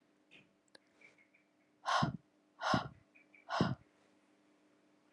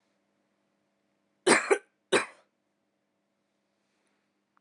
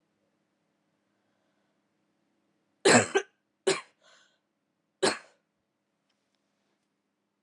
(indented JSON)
{
  "exhalation_length": "5.1 s",
  "exhalation_amplitude": 3829,
  "exhalation_signal_mean_std_ratio": 0.33,
  "cough_length": "4.6 s",
  "cough_amplitude": 14873,
  "cough_signal_mean_std_ratio": 0.21,
  "three_cough_length": "7.4 s",
  "three_cough_amplitude": 15576,
  "three_cough_signal_mean_std_ratio": 0.2,
  "survey_phase": "alpha (2021-03-01 to 2021-08-12)",
  "age": "18-44",
  "gender": "Female",
  "wearing_mask": "No",
  "symptom_new_continuous_cough": true,
  "symptom_fever_high_temperature": true,
  "symptom_headache": true,
  "smoker_status": "Never smoked",
  "respiratory_condition_asthma": false,
  "respiratory_condition_other": false,
  "recruitment_source": "Test and Trace",
  "submission_delay": "2 days",
  "covid_test_result": "Positive",
  "covid_test_method": "RT-qPCR"
}